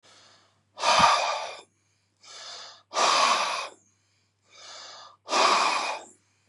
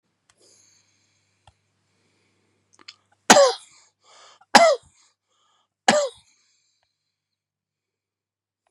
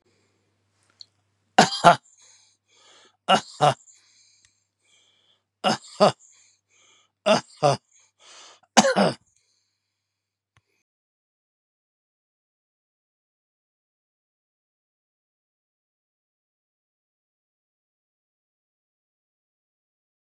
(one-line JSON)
{"exhalation_length": "6.5 s", "exhalation_amplitude": 16989, "exhalation_signal_mean_std_ratio": 0.49, "three_cough_length": "8.7 s", "three_cough_amplitude": 32768, "three_cough_signal_mean_std_ratio": 0.21, "cough_length": "20.4 s", "cough_amplitude": 32767, "cough_signal_mean_std_ratio": 0.18, "survey_phase": "beta (2021-08-13 to 2022-03-07)", "age": "65+", "gender": "Male", "wearing_mask": "No", "symptom_none": true, "symptom_onset": "12 days", "smoker_status": "Never smoked", "respiratory_condition_asthma": false, "respiratory_condition_other": false, "recruitment_source": "REACT", "submission_delay": "2 days", "covid_test_result": "Negative", "covid_test_method": "RT-qPCR", "influenza_a_test_result": "Negative", "influenza_b_test_result": "Negative"}